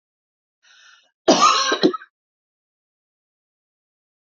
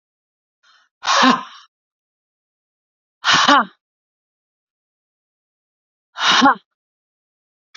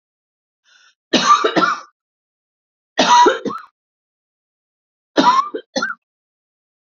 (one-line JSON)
{"cough_length": "4.3 s", "cough_amplitude": 29192, "cough_signal_mean_std_ratio": 0.29, "exhalation_length": "7.8 s", "exhalation_amplitude": 29192, "exhalation_signal_mean_std_ratio": 0.3, "three_cough_length": "6.8 s", "three_cough_amplitude": 30043, "three_cough_signal_mean_std_ratio": 0.38, "survey_phase": "beta (2021-08-13 to 2022-03-07)", "age": "45-64", "gender": "Female", "wearing_mask": "No", "symptom_diarrhoea": true, "symptom_fatigue": true, "symptom_fever_high_temperature": true, "symptom_headache": true, "symptom_change_to_sense_of_smell_or_taste": true, "symptom_onset": "5 days", "smoker_status": "Never smoked", "respiratory_condition_asthma": false, "respiratory_condition_other": false, "recruitment_source": "Test and Trace", "submission_delay": "2 days", "covid_test_result": "Positive", "covid_test_method": "RT-qPCR", "covid_ct_value": 35.1, "covid_ct_gene": "N gene"}